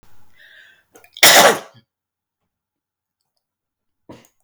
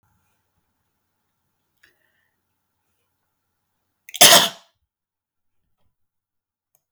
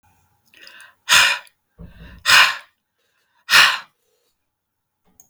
cough_length: 4.4 s
cough_amplitude: 32768
cough_signal_mean_std_ratio: 0.24
three_cough_length: 6.9 s
three_cough_amplitude: 32768
three_cough_signal_mean_std_ratio: 0.16
exhalation_length: 5.3 s
exhalation_amplitude: 32768
exhalation_signal_mean_std_ratio: 0.32
survey_phase: beta (2021-08-13 to 2022-03-07)
age: 45-64
gender: Female
wearing_mask: 'No'
symptom_sore_throat: true
symptom_headache: true
symptom_onset: 13 days
smoker_status: Never smoked
respiratory_condition_asthma: false
respiratory_condition_other: false
recruitment_source: REACT
submission_delay: 1 day
covid_test_result: Negative
covid_test_method: RT-qPCR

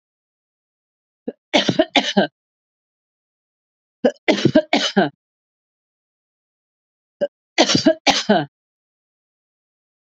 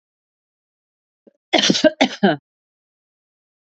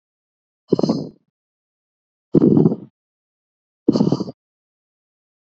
three_cough_length: 10.1 s
three_cough_amplitude: 31059
three_cough_signal_mean_std_ratio: 0.32
cough_length: 3.7 s
cough_amplitude: 30717
cough_signal_mean_std_ratio: 0.29
exhalation_length: 5.5 s
exhalation_amplitude: 32768
exhalation_signal_mean_std_ratio: 0.3
survey_phase: beta (2021-08-13 to 2022-03-07)
age: 45-64
gender: Female
wearing_mask: 'No'
symptom_none: true
smoker_status: Never smoked
respiratory_condition_asthma: false
respiratory_condition_other: false
recruitment_source: REACT
submission_delay: 2 days
covid_test_result: Negative
covid_test_method: RT-qPCR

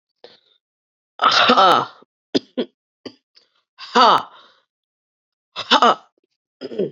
exhalation_length: 6.9 s
exhalation_amplitude: 29742
exhalation_signal_mean_std_ratio: 0.35
survey_phase: beta (2021-08-13 to 2022-03-07)
age: 18-44
gender: Female
wearing_mask: 'No'
symptom_cough_any: true
symptom_sore_throat: true
symptom_abdominal_pain: true
symptom_fatigue: true
symptom_change_to_sense_of_smell_or_taste: true
symptom_loss_of_taste: true
symptom_onset: 2 days
smoker_status: Never smoked
respiratory_condition_asthma: false
respiratory_condition_other: false
recruitment_source: Test and Trace
submission_delay: 2 days
covid_test_result: Positive
covid_test_method: RT-qPCR
covid_ct_value: 20.1
covid_ct_gene: ORF1ab gene
covid_ct_mean: 20.6
covid_viral_load: 170000 copies/ml
covid_viral_load_category: Low viral load (10K-1M copies/ml)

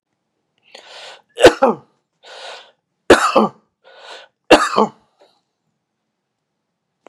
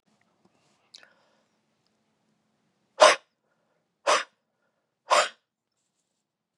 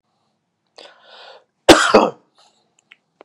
three_cough_length: 7.1 s
three_cough_amplitude: 32768
three_cough_signal_mean_std_ratio: 0.27
exhalation_length: 6.6 s
exhalation_amplitude: 27606
exhalation_signal_mean_std_ratio: 0.19
cough_length: 3.2 s
cough_amplitude: 32768
cough_signal_mean_std_ratio: 0.25
survey_phase: beta (2021-08-13 to 2022-03-07)
age: 45-64
gender: Male
wearing_mask: 'No'
symptom_none: true
smoker_status: Never smoked
respiratory_condition_asthma: false
respiratory_condition_other: false
recruitment_source: REACT
submission_delay: 1 day
covid_test_result: Negative
covid_test_method: RT-qPCR
influenza_a_test_result: Negative
influenza_b_test_result: Negative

